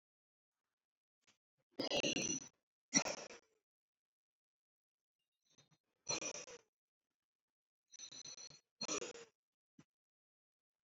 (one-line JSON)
{"exhalation_length": "10.8 s", "exhalation_amplitude": 3995, "exhalation_signal_mean_std_ratio": 0.28, "survey_phase": "beta (2021-08-13 to 2022-03-07)", "age": "65+", "gender": "Male", "wearing_mask": "No", "symptom_none": true, "smoker_status": "Never smoked", "respiratory_condition_asthma": false, "respiratory_condition_other": false, "recruitment_source": "REACT", "submission_delay": "2 days", "covid_test_result": "Negative", "covid_test_method": "RT-qPCR"}